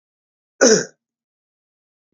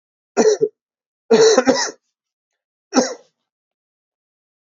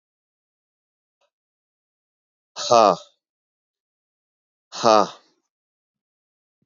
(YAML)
cough_length: 2.1 s
cough_amplitude: 32767
cough_signal_mean_std_ratio: 0.25
three_cough_length: 4.7 s
three_cough_amplitude: 30144
three_cough_signal_mean_std_ratio: 0.36
exhalation_length: 6.7 s
exhalation_amplitude: 32650
exhalation_signal_mean_std_ratio: 0.2
survey_phase: alpha (2021-03-01 to 2021-08-12)
age: 45-64
gender: Male
wearing_mask: 'No'
symptom_cough_any: true
symptom_headache: true
smoker_status: Never smoked
respiratory_condition_asthma: true
respiratory_condition_other: false
recruitment_source: Test and Trace
submission_delay: 1 day
covid_test_result: Positive
covid_test_method: RT-qPCR